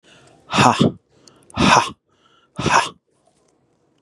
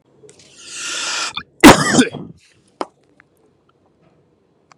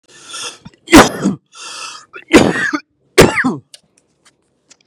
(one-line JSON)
{"exhalation_length": "4.0 s", "exhalation_amplitude": 32767, "exhalation_signal_mean_std_ratio": 0.38, "cough_length": "4.8 s", "cough_amplitude": 32768, "cough_signal_mean_std_ratio": 0.28, "three_cough_length": "4.9 s", "three_cough_amplitude": 32768, "three_cough_signal_mean_std_ratio": 0.38, "survey_phase": "beta (2021-08-13 to 2022-03-07)", "age": "45-64", "gender": "Male", "wearing_mask": "No", "symptom_none": true, "smoker_status": "Never smoked", "respiratory_condition_asthma": false, "respiratory_condition_other": false, "recruitment_source": "REACT", "submission_delay": "1 day", "covid_test_result": "Negative", "covid_test_method": "RT-qPCR", "influenza_a_test_result": "Negative", "influenza_b_test_result": "Negative"}